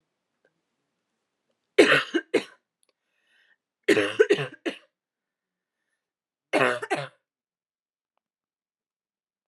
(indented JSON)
{
  "three_cough_length": "9.5 s",
  "three_cough_amplitude": 24896,
  "three_cough_signal_mean_std_ratio": 0.26,
  "survey_phase": "beta (2021-08-13 to 2022-03-07)",
  "age": "18-44",
  "gender": "Female",
  "wearing_mask": "No",
  "symptom_fatigue": true,
  "symptom_fever_high_temperature": true,
  "symptom_headache": true,
  "symptom_onset": "3 days",
  "smoker_status": "Never smoked",
  "respiratory_condition_asthma": false,
  "respiratory_condition_other": false,
  "recruitment_source": "Test and Trace",
  "submission_delay": "2 days",
  "covid_test_result": "Positive",
  "covid_test_method": "RT-qPCR",
  "covid_ct_value": 28.9,
  "covid_ct_gene": "N gene"
}